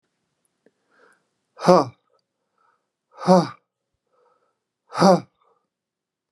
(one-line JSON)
{"exhalation_length": "6.3 s", "exhalation_amplitude": 32723, "exhalation_signal_mean_std_ratio": 0.23, "survey_phase": "beta (2021-08-13 to 2022-03-07)", "age": "45-64", "gender": "Male", "wearing_mask": "No", "symptom_headache": true, "smoker_status": "Never smoked", "respiratory_condition_asthma": false, "respiratory_condition_other": false, "recruitment_source": "REACT", "submission_delay": "1 day", "covid_test_result": "Negative", "covid_test_method": "RT-qPCR"}